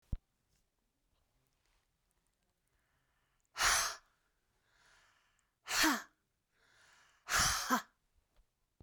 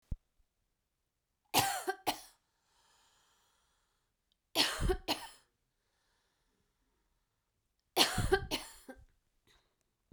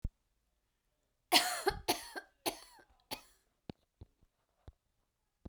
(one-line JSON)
{"exhalation_length": "8.8 s", "exhalation_amplitude": 4367, "exhalation_signal_mean_std_ratio": 0.3, "three_cough_length": "10.1 s", "three_cough_amplitude": 9432, "three_cough_signal_mean_std_ratio": 0.3, "cough_length": "5.5 s", "cough_amplitude": 9804, "cough_signal_mean_std_ratio": 0.26, "survey_phase": "beta (2021-08-13 to 2022-03-07)", "age": "45-64", "gender": "Female", "wearing_mask": "No", "symptom_runny_or_blocked_nose": true, "symptom_onset": "10 days", "smoker_status": "Never smoked", "respiratory_condition_asthma": true, "respiratory_condition_other": false, "recruitment_source": "REACT", "submission_delay": "1 day", "covid_test_result": "Negative", "covid_test_method": "RT-qPCR", "influenza_a_test_result": "Negative", "influenza_b_test_result": "Negative"}